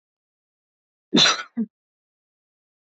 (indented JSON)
{
  "cough_length": "2.8 s",
  "cough_amplitude": 18393,
  "cough_signal_mean_std_ratio": 0.26,
  "survey_phase": "beta (2021-08-13 to 2022-03-07)",
  "age": "18-44",
  "gender": "Female",
  "wearing_mask": "No",
  "symptom_none": true,
  "symptom_onset": "10 days",
  "smoker_status": "Never smoked",
  "respiratory_condition_asthma": true,
  "respiratory_condition_other": false,
  "recruitment_source": "REACT",
  "submission_delay": "1 day",
  "covid_test_result": "Negative",
  "covid_test_method": "RT-qPCR",
  "influenza_a_test_result": "Negative",
  "influenza_b_test_result": "Negative"
}